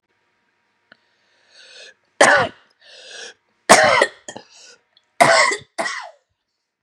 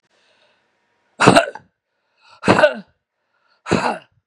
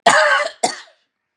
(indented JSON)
{
  "three_cough_length": "6.8 s",
  "three_cough_amplitude": 32768,
  "three_cough_signal_mean_std_ratio": 0.33,
  "exhalation_length": "4.3 s",
  "exhalation_amplitude": 32768,
  "exhalation_signal_mean_std_ratio": 0.32,
  "cough_length": "1.4 s",
  "cough_amplitude": 32724,
  "cough_signal_mean_std_ratio": 0.52,
  "survey_phase": "beta (2021-08-13 to 2022-03-07)",
  "age": "45-64",
  "gender": "Female",
  "wearing_mask": "No",
  "symptom_none": true,
  "smoker_status": "Never smoked",
  "respiratory_condition_asthma": false,
  "respiratory_condition_other": false,
  "recruitment_source": "REACT",
  "submission_delay": "5 days",
  "covid_test_result": "Negative",
  "covid_test_method": "RT-qPCR",
  "influenza_a_test_result": "Negative",
  "influenza_b_test_result": "Negative"
}